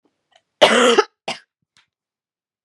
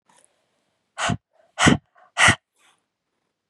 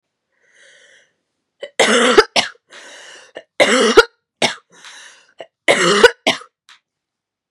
{"cough_length": "2.6 s", "cough_amplitude": 32768, "cough_signal_mean_std_ratio": 0.32, "exhalation_length": "3.5 s", "exhalation_amplitude": 31876, "exhalation_signal_mean_std_ratio": 0.28, "three_cough_length": "7.5 s", "three_cough_amplitude": 32768, "three_cough_signal_mean_std_ratio": 0.36, "survey_phase": "beta (2021-08-13 to 2022-03-07)", "age": "18-44", "gender": "Female", "wearing_mask": "No", "symptom_cough_any": true, "symptom_runny_or_blocked_nose": true, "symptom_shortness_of_breath": true, "symptom_sore_throat": true, "symptom_fatigue": true, "symptom_fever_high_temperature": true, "symptom_headache": true, "symptom_onset": "4 days", "smoker_status": "Never smoked", "respiratory_condition_asthma": false, "respiratory_condition_other": false, "recruitment_source": "Test and Trace", "submission_delay": "3 days", "covid_test_result": "Positive", "covid_test_method": "RT-qPCR"}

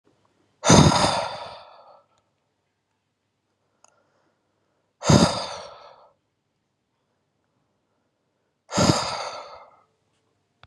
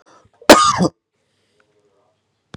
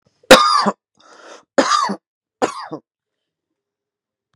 {"exhalation_length": "10.7 s", "exhalation_amplitude": 30214, "exhalation_signal_mean_std_ratio": 0.28, "cough_length": "2.6 s", "cough_amplitude": 32768, "cough_signal_mean_std_ratio": 0.28, "three_cough_length": "4.4 s", "three_cough_amplitude": 32768, "three_cough_signal_mean_std_ratio": 0.32, "survey_phase": "beta (2021-08-13 to 2022-03-07)", "age": "18-44", "gender": "Male", "wearing_mask": "No", "symptom_none": true, "smoker_status": "Never smoked", "respiratory_condition_asthma": false, "respiratory_condition_other": false, "recruitment_source": "REACT", "submission_delay": "4 days", "covid_test_result": "Negative", "covid_test_method": "RT-qPCR", "influenza_a_test_result": "Negative", "influenza_b_test_result": "Negative"}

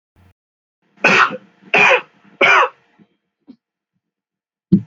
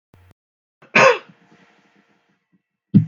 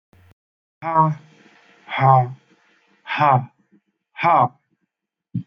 {"three_cough_length": "4.9 s", "three_cough_amplitude": 32768, "three_cough_signal_mean_std_ratio": 0.36, "cough_length": "3.1 s", "cough_amplitude": 32018, "cough_signal_mean_std_ratio": 0.26, "exhalation_length": "5.5 s", "exhalation_amplitude": 23942, "exhalation_signal_mean_std_ratio": 0.39, "survey_phase": "beta (2021-08-13 to 2022-03-07)", "age": "45-64", "gender": "Male", "wearing_mask": "No", "symptom_none": true, "smoker_status": "Ex-smoker", "respiratory_condition_asthma": false, "respiratory_condition_other": false, "recruitment_source": "REACT", "submission_delay": "2 days", "covid_test_result": "Negative", "covid_test_method": "RT-qPCR", "influenza_a_test_result": "Negative", "influenza_b_test_result": "Negative"}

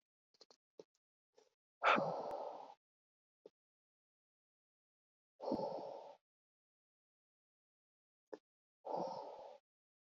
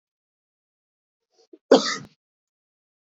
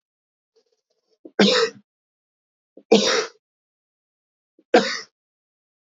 {"exhalation_length": "10.2 s", "exhalation_amplitude": 3294, "exhalation_signal_mean_std_ratio": 0.29, "cough_length": "3.1 s", "cough_amplitude": 24651, "cough_signal_mean_std_ratio": 0.18, "three_cough_length": "5.8 s", "three_cough_amplitude": 26239, "three_cough_signal_mean_std_ratio": 0.29, "survey_phase": "beta (2021-08-13 to 2022-03-07)", "age": "18-44", "gender": "Male", "wearing_mask": "No", "symptom_cough_any": true, "symptom_new_continuous_cough": true, "symptom_runny_or_blocked_nose": true, "symptom_fatigue": true, "symptom_change_to_sense_of_smell_or_taste": true, "symptom_onset": "3 days", "smoker_status": "Never smoked", "respiratory_condition_asthma": false, "respiratory_condition_other": false, "recruitment_source": "Test and Trace", "submission_delay": "2 days", "covid_test_result": "Positive", "covid_test_method": "ePCR"}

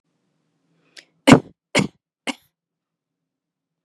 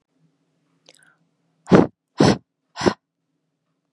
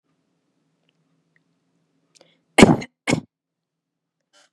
{"three_cough_length": "3.8 s", "three_cough_amplitude": 32768, "three_cough_signal_mean_std_ratio": 0.17, "exhalation_length": "3.9 s", "exhalation_amplitude": 32768, "exhalation_signal_mean_std_ratio": 0.24, "cough_length": "4.5 s", "cough_amplitude": 32768, "cough_signal_mean_std_ratio": 0.17, "survey_phase": "beta (2021-08-13 to 2022-03-07)", "age": "18-44", "gender": "Female", "wearing_mask": "No", "symptom_cough_any": true, "symptom_new_continuous_cough": true, "symptom_runny_or_blocked_nose": true, "symptom_sore_throat": true, "symptom_diarrhoea": true, "symptom_fatigue": true, "symptom_headache": true, "symptom_other": true, "symptom_onset": "3 days", "smoker_status": "Never smoked", "respiratory_condition_asthma": false, "respiratory_condition_other": false, "recruitment_source": "Test and Trace", "submission_delay": "2 days", "covid_test_result": "Positive", "covid_test_method": "RT-qPCR", "covid_ct_value": 17.2, "covid_ct_gene": "N gene", "covid_ct_mean": 17.8, "covid_viral_load": "1500000 copies/ml", "covid_viral_load_category": "High viral load (>1M copies/ml)"}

